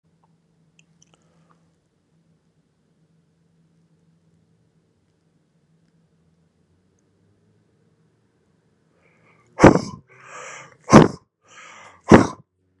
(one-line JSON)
{"exhalation_length": "12.8 s", "exhalation_amplitude": 32768, "exhalation_signal_mean_std_ratio": 0.16, "survey_phase": "beta (2021-08-13 to 2022-03-07)", "age": "18-44", "gender": "Male", "wearing_mask": "No", "symptom_none": true, "smoker_status": "Ex-smoker", "respiratory_condition_asthma": false, "respiratory_condition_other": false, "recruitment_source": "REACT", "submission_delay": "3 days", "covid_test_result": "Negative", "covid_test_method": "RT-qPCR", "influenza_a_test_result": "Unknown/Void", "influenza_b_test_result": "Unknown/Void"}